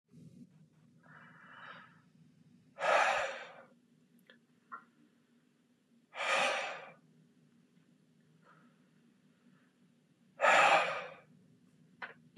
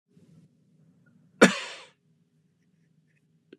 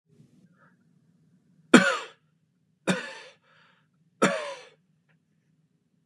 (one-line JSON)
{"exhalation_length": "12.4 s", "exhalation_amplitude": 6650, "exhalation_signal_mean_std_ratio": 0.32, "cough_length": "3.6 s", "cough_amplitude": 25774, "cough_signal_mean_std_ratio": 0.16, "three_cough_length": "6.1 s", "three_cough_amplitude": 32538, "three_cough_signal_mean_std_ratio": 0.22, "survey_phase": "beta (2021-08-13 to 2022-03-07)", "age": "18-44", "gender": "Male", "wearing_mask": "No", "symptom_none": true, "symptom_onset": "4 days", "smoker_status": "Never smoked", "respiratory_condition_asthma": false, "respiratory_condition_other": false, "recruitment_source": "REACT", "submission_delay": "1 day", "covid_test_result": "Negative", "covid_test_method": "RT-qPCR"}